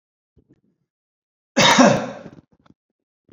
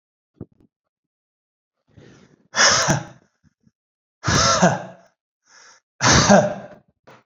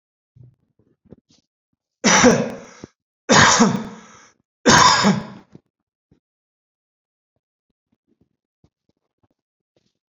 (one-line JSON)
{"cough_length": "3.3 s", "cough_amplitude": 27848, "cough_signal_mean_std_ratio": 0.31, "exhalation_length": "7.3 s", "exhalation_amplitude": 30101, "exhalation_signal_mean_std_ratio": 0.37, "three_cough_length": "10.2 s", "three_cough_amplitude": 29893, "three_cough_signal_mean_std_ratio": 0.31, "survey_phase": "beta (2021-08-13 to 2022-03-07)", "age": "45-64", "gender": "Male", "wearing_mask": "No", "symptom_none": true, "smoker_status": "Ex-smoker", "respiratory_condition_asthma": false, "respiratory_condition_other": false, "recruitment_source": "REACT", "submission_delay": "2 days", "covid_test_result": "Negative", "covid_test_method": "RT-qPCR"}